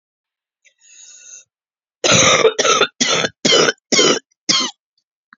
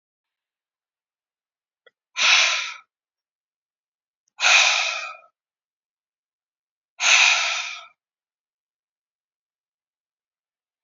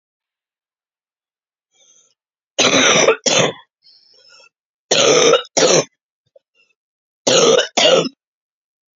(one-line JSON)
{"cough_length": "5.4 s", "cough_amplitude": 32767, "cough_signal_mean_std_ratio": 0.48, "exhalation_length": "10.8 s", "exhalation_amplitude": 28724, "exhalation_signal_mean_std_ratio": 0.31, "three_cough_length": "9.0 s", "three_cough_amplitude": 32616, "three_cough_signal_mean_std_ratio": 0.42, "survey_phase": "beta (2021-08-13 to 2022-03-07)", "age": "18-44", "gender": "Female", "wearing_mask": "No", "symptom_cough_any": true, "symptom_runny_or_blocked_nose": true, "symptom_shortness_of_breath": true, "symptom_sore_throat": true, "symptom_fatigue": true, "symptom_headache": true, "smoker_status": "Never smoked", "respiratory_condition_asthma": false, "respiratory_condition_other": false, "recruitment_source": "Test and Trace", "submission_delay": "1 day", "covid_test_result": "Positive", "covid_test_method": "RT-qPCR", "covid_ct_value": 29.8, "covid_ct_gene": "ORF1ab gene"}